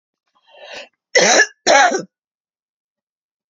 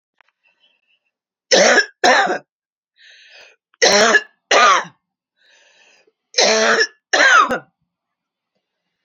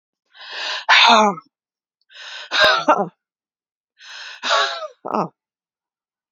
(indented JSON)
{
  "cough_length": "3.5 s",
  "cough_amplitude": 30351,
  "cough_signal_mean_std_ratio": 0.36,
  "three_cough_length": "9.0 s",
  "three_cough_amplitude": 32767,
  "three_cough_signal_mean_std_ratio": 0.42,
  "exhalation_length": "6.3 s",
  "exhalation_amplitude": 30252,
  "exhalation_signal_mean_std_ratio": 0.41,
  "survey_phase": "beta (2021-08-13 to 2022-03-07)",
  "age": "45-64",
  "gender": "Female",
  "wearing_mask": "No",
  "symptom_none": true,
  "smoker_status": "Never smoked",
  "respiratory_condition_asthma": true,
  "respiratory_condition_other": false,
  "recruitment_source": "REACT",
  "submission_delay": "1 day",
  "covid_test_result": "Negative",
  "covid_test_method": "RT-qPCR"
}